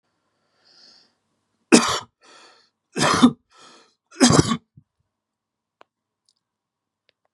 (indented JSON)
{
  "three_cough_length": "7.3 s",
  "three_cough_amplitude": 32768,
  "three_cough_signal_mean_std_ratio": 0.26,
  "survey_phase": "beta (2021-08-13 to 2022-03-07)",
  "age": "65+",
  "gender": "Male",
  "wearing_mask": "No",
  "symptom_none": true,
  "smoker_status": "Never smoked",
  "respiratory_condition_asthma": false,
  "respiratory_condition_other": false,
  "recruitment_source": "REACT",
  "submission_delay": "2 days",
  "covid_test_result": "Negative",
  "covid_test_method": "RT-qPCR",
  "influenza_a_test_result": "Negative",
  "influenza_b_test_result": "Negative"
}